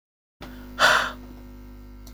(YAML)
exhalation_length: 2.1 s
exhalation_amplitude: 19833
exhalation_signal_mean_std_ratio: 0.41
survey_phase: beta (2021-08-13 to 2022-03-07)
age: 45-64
gender: Female
wearing_mask: 'No'
symptom_none: true
smoker_status: Ex-smoker
respiratory_condition_asthma: false
respiratory_condition_other: false
recruitment_source: REACT
submission_delay: 2 days
covid_test_result: Negative
covid_test_method: RT-qPCR
influenza_a_test_result: Negative
influenza_b_test_result: Negative